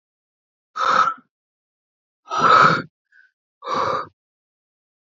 {"exhalation_length": "5.1 s", "exhalation_amplitude": 26842, "exhalation_signal_mean_std_ratio": 0.37, "survey_phase": "alpha (2021-03-01 to 2021-08-12)", "age": "18-44", "gender": "Female", "wearing_mask": "No", "symptom_none": true, "smoker_status": "Current smoker (1 to 10 cigarettes per day)", "respiratory_condition_asthma": false, "respiratory_condition_other": false, "recruitment_source": "REACT", "submission_delay": "5 days", "covid_test_result": "Negative", "covid_test_method": "RT-qPCR"}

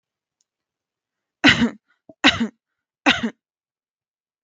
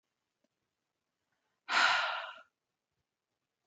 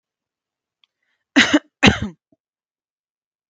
{"three_cough_length": "4.4 s", "three_cough_amplitude": 32768, "three_cough_signal_mean_std_ratio": 0.27, "exhalation_length": "3.7 s", "exhalation_amplitude": 5507, "exhalation_signal_mean_std_ratio": 0.3, "cough_length": "3.5 s", "cough_amplitude": 32768, "cough_signal_mean_std_ratio": 0.24, "survey_phase": "beta (2021-08-13 to 2022-03-07)", "age": "18-44", "gender": "Female", "wearing_mask": "No", "symptom_none": true, "smoker_status": "Never smoked", "respiratory_condition_asthma": false, "respiratory_condition_other": false, "recruitment_source": "REACT", "submission_delay": "13 days", "covid_test_result": "Negative", "covid_test_method": "RT-qPCR"}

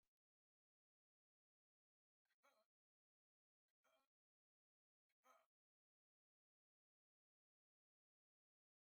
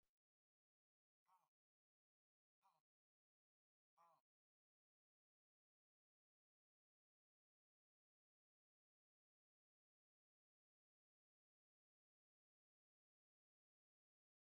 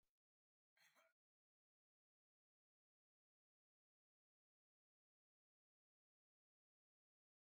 {"three_cough_length": "8.9 s", "three_cough_amplitude": 28, "three_cough_signal_mean_std_ratio": 0.19, "exhalation_length": "14.5 s", "exhalation_amplitude": 18, "exhalation_signal_mean_std_ratio": 0.14, "cough_length": "7.5 s", "cough_amplitude": 24, "cough_signal_mean_std_ratio": 0.16, "survey_phase": "alpha (2021-03-01 to 2021-08-12)", "age": "65+", "gender": "Male", "wearing_mask": "No", "symptom_none": true, "smoker_status": "Ex-smoker", "respiratory_condition_asthma": false, "respiratory_condition_other": false, "recruitment_source": "REACT", "submission_delay": "10 days", "covid_test_result": "Negative", "covid_test_method": "RT-qPCR"}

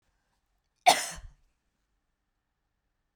{"cough_length": "3.2 s", "cough_amplitude": 14495, "cough_signal_mean_std_ratio": 0.17, "survey_phase": "beta (2021-08-13 to 2022-03-07)", "age": "65+", "gender": "Female", "wearing_mask": "No", "symptom_none": true, "smoker_status": "Ex-smoker", "respiratory_condition_asthma": false, "respiratory_condition_other": false, "recruitment_source": "REACT", "submission_delay": "2 days", "covid_test_result": "Negative", "covid_test_method": "RT-qPCR"}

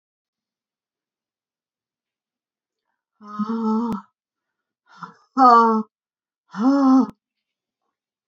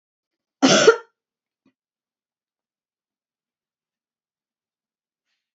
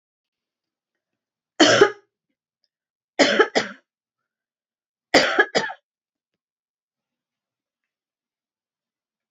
{"exhalation_length": "8.3 s", "exhalation_amplitude": 28105, "exhalation_signal_mean_std_ratio": 0.33, "cough_length": "5.5 s", "cough_amplitude": 29719, "cough_signal_mean_std_ratio": 0.18, "three_cough_length": "9.3 s", "three_cough_amplitude": 31392, "three_cough_signal_mean_std_ratio": 0.25, "survey_phase": "beta (2021-08-13 to 2022-03-07)", "age": "65+", "gender": "Female", "wearing_mask": "No", "symptom_cough_any": true, "symptom_runny_or_blocked_nose": true, "symptom_onset": "2 days", "smoker_status": "Never smoked", "respiratory_condition_asthma": false, "respiratory_condition_other": false, "recruitment_source": "Test and Trace", "submission_delay": "2 days", "covid_test_result": "Positive", "covid_test_method": "RT-qPCR", "covid_ct_value": 23.6, "covid_ct_gene": "ORF1ab gene", "covid_ct_mean": 24.0, "covid_viral_load": "14000 copies/ml", "covid_viral_load_category": "Low viral load (10K-1M copies/ml)"}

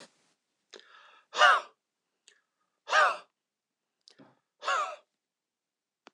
{"exhalation_length": "6.1 s", "exhalation_amplitude": 13048, "exhalation_signal_mean_std_ratio": 0.26, "survey_phase": "alpha (2021-03-01 to 2021-08-12)", "age": "65+", "gender": "Male", "wearing_mask": "No", "symptom_none": true, "smoker_status": "Never smoked", "respiratory_condition_asthma": false, "respiratory_condition_other": false, "recruitment_source": "REACT", "submission_delay": "1 day", "covid_test_result": "Negative", "covid_test_method": "RT-qPCR"}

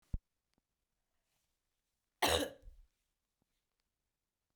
{"cough_length": "4.6 s", "cough_amplitude": 5094, "cough_signal_mean_std_ratio": 0.2, "survey_phase": "beta (2021-08-13 to 2022-03-07)", "age": "45-64", "gender": "Female", "wearing_mask": "No", "symptom_cough_any": true, "symptom_runny_or_blocked_nose": true, "symptom_sore_throat": true, "symptom_fatigue": true, "symptom_headache": true, "symptom_change_to_sense_of_smell_or_taste": true, "smoker_status": "Never smoked", "respiratory_condition_asthma": false, "respiratory_condition_other": false, "recruitment_source": "Test and Trace", "submission_delay": "2 days", "covid_test_result": "Positive", "covid_test_method": "RT-qPCR", "covid_ct_value": 33.1, "covid_ct_gene": "N gene"}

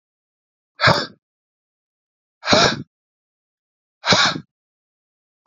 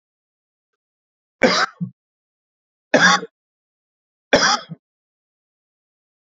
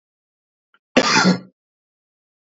{"exhalation_length": "5.5 s", "exhalation_amplitude": 32767, "exhalation_signal_mean_std_ratio": 0.3, "three_cough_length": "6.3 s", "three_cough_amplitude": 32767, "three_cough_signal_mean_std_ratio": 0.28, "cough_length": "2.5 s", "cough_amplitude": 27567, "cough_signal_mean_std_ratio": 0.32, "survey_phase": "beta (2021-08-13 to 2022-03-07)", "age": "18-44", "gender": "Male", "wearing_mask": "Yes", "symptom_none": true, "smoker_status": "Never smoked", "respiratory_condition_asthma": false, "respiratory_condition_other": false, "recruitment_source": "REACT", "submission_delay": "2 days", "covid_test_result": "Negative", "covid_test_method": "RT-qPCR", "influenza_a_test_result": "Negative", "influenza_b_test_result": "Negative"}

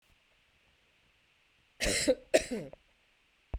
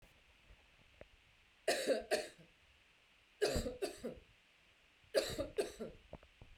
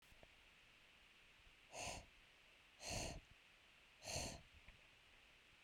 {"cough_length": "3.6 s", "cough_amplitude": 10716, "cough_signal_mean_std_ratio": 0.31, "three_cough_length": "6.6 s", "three_cough_amplitude": 3181, "three_cough_signal_mean_std_ratio": 0.41, "exhalation_length": "5.6 s", "exhalation_amplitude": 671, "exhalation_signal_mean_std_ratio": 0.53, "survey_phase": "beta (2021-08-13 to 2022-03-07)", "age": "45-64", "gender": "Female", "wearing_mask": "No", "symptom_none": true, "smoker_status": "Ex-smoker", "respiratory_condition_asthma": false, "respiratory_condition_other": false, "recruitment_source": "REACT", "submission_delay": "1 day", "covid_test_result": "Negative", "covid_test_method": "RT-qPCR"}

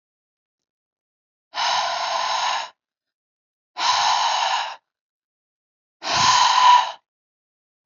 {"exhalation_length": "7.9 s", "exhalation_amplitude": 24588, "exhalation_signal_mean_std_ratio": 0.49, "survey_phase": "beta (2021-08-13 to 2022-03-07)", "age": "18-44", "gender": "Female", "wearing_mask": "No", "symptom_none": true, "smoker_status": "Never smoked", "respiratory_condition_asthma": false, "respiratory_condition_other": false, "recruitment_source": "Test and Trace", "submission_delay": "0 days", "covid_test_result": "Positive", "covid_test_method": "LFT"}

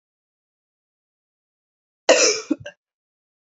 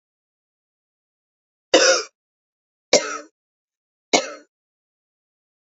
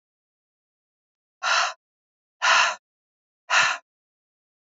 {"cough_length": "3.5 s", "cough_amplitude": 31462, "cough_signal_mean_std_ratio": 0.24, "three_cough_length": "5.6 s", "three_cough_amplitude": 32272, "three_cough_signal_mean_std_ratio": 0.24, "exhalation_length": "4.7 s", "exhalation_amplitude": 15752, "exhalation_signal_mean_std_ratio": 0.34, "survey_phase": "alpha (2021-03-01 to 2021-08-12)", "age": "45-64", "gender": "Female", "wearing_mask": "No", "symptom_headache": true, "symptom_change_to_sense_of_smell_or_taste": true, "smoker_status": "Ex-smoker", "respiratory_condition_asthma": false, "respiratory_condition_other": false, "recruitment_source": "REACT", "covid_test_method": "RT-qPCR"}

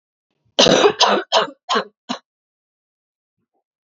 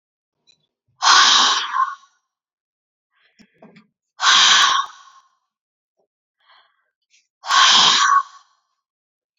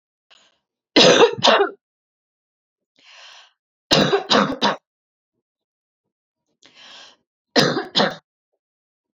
{"cough_length": "3.8 s", "cough_amplitude": 32768, "cough_signal_mean_std_ratio": 0.38, "exhalation_length": "9.4 s", "exhalation_amplitude": 32767, "exhalation_signal_mean_std_ratio": 0.4, "three_cough_length": "9.1 s", "three_cough_amplitude": 31232, "three_cough_signal_mean_std_ratio": 0.34, "survey_phase": "alpha (2021-03-01 to 2021-08-12)", "age": "18-44", "gender": "Female", "wearing_mask": "No", "symptom_fatigue": true, "symptom_headache": true, "symptom_change_to_sense_of_smell_or_taste": true, "smoker_status": "Ex-smoker", "respiratory_condition_asthma": false, "respiratory_condition_other": false, "recruitment_source": "Test and Trace", "submission_delay": "1 day", "covid_ct_value": 28.0, "covid_ct_gene": "ORF1ab gene"}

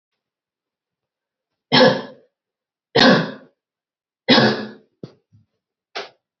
{"three_cough_length": "6.4 s", "three_cough_amplitude": 31603, "three_cough_signal_mean_std_ratio": 0.31, "survey_phase": "beta (2021-08-13 to 2022-03-07)", "age": "18-44", "gender": "Female", "wearing_mask": "No", "symptom_cough_any": true, "symptom_runny_or_blocked_nose": true, "symptom_fatigue": true, "symptom_headache": true, "symptom_onset": "5 days", "smoker_status": "Never smoked", "respiratory_condition_asthma": false, "respiratory_condition_other": false, "recruitment_source": "Test and Trace", "submission_delay": "2 days", "covid_test_result": "Positive", "covid_test_method": "RT-qPCR", "covid_ct_value": 16.5, "covid_ct_gene": "ORF1ab gene", "covid_ct_mean": 16.8, "covid_viral_load": "3100000 copies/ml", "covid_viral_load_category": "High viral load (>1M copies/ml)"}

